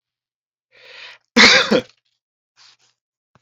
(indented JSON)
{
  "cough_length": "3.4 s",
  "cough_amplitude": 30679,
  "cough_signal_mean_std_ratio": 0.28,
  "survey_phase": "beta (2021-08-13 to 2022-03-07)",
  "age": "45-64",
  "gender": "Male",
  "wearing_mask": "No",
  "symptom_none": true,
  "symptom_onset": "9 days",
  "smoker_status": "Never smoked",
  "respiratory_condition_asthma": false,
  "respiratory_condition_other": false,
  "recruitment_source": "Test and Trace",
  "submission_delay": "2 days",
  "covid_test_result": "Positive",
  "covid_test_method": "ePCR"
}